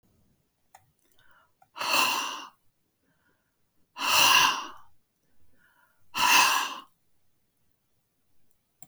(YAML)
exhalation_length: 8.9 s
exhalation_amplitude: 14865
exhalation_signal_mean_std_ratio: 0.36
survey_phase: alpha (2021-03-01 to 2021-08-12)
age: 65+
gender: Female
wearing_mask: 'No'
symptom_none: true
smoker_status: Never smoked
respiratory_condition_asthma: false
respiratory_condition_other: false
recruitment_source: REACT
submission_delay: 1 day
covid_test_result: Negative
covid_test_method: RT-qPCR